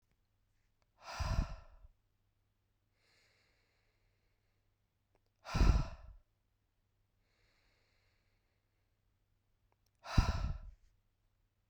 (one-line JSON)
{"exhalation_length": "11.7 s", "exhalation_amplitude": 5508, "exhalation_signal_mean_std_ratio": 0.24, "survey_phase": "beta (2021-08-13 to 2022-03-07)", "age": "18-44", "gender": "Female", "wearing_mask": "No", "symptom_cough_any": true, "symptom_runny_or_blocked_nose": true, "symptom_fatigue": true, "symptom_headache": true, "symptom_change_to_sense_of_smell_or_taste": true, "smoker_status": "Never smoked", "respiratory_condition_asthma": false, "respiratory_condition_other": false, "recruitment_source": "Test and Trace", "submission_delay": "1 day", "covid_test_result": "Positive", "covid_test_method": "LFT"}